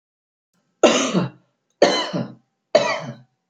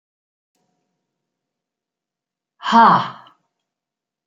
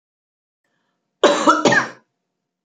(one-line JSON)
{"three_cough_length": "3.5 s", "three_cough_amplitude": 27859, "three_cough_signal_mean_std_ratio": 0.42, "exhalation_length": "4.3 s", "exhalation_amplitude": 28687, "exhalation_signal_mean_std_ratio": 0.24, "cough_length": "2.6 s", "cough_amplitude": 29211, "cough_signal_mean_std_ratio": 0.36, "survey_phase": "beta (2021-08-13 to 2022-03-07)", "age": "65+", "gender": "Female", "wearing_mask": "No", "symptom_none": true, "smoker_status": "Ex-smoker", "respiratory_condition_asthma": false, "respiratory_condition_other": false, "recruitment_source": "REACT", "submission_delay": "4 days", "covid_test_result": "Negative", "covid_test_method": "RT-qPCR"}